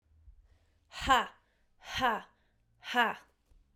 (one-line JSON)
{"exhalation_length": "3.8 s", "exhalation_amplitude": 7640, "exhalation_signal_mean_std_ratio": 0.35, "survey_phase": "beta (2021-08-13 to 2022-03-07)", "age": "18-44", "gender": "Female", "wearing_mask": "No", "symptom_none": true, "smoker_status": "Current smoker (e-cigarettes or vapes only)", "respiratory_condition_asthma": false, "respiratory_condition_other": false, "recruitment_source": "REACT", "submission_delay": "3 days", "covid_test_result": "Negative", "covid_test_method": "RT-qPCR"}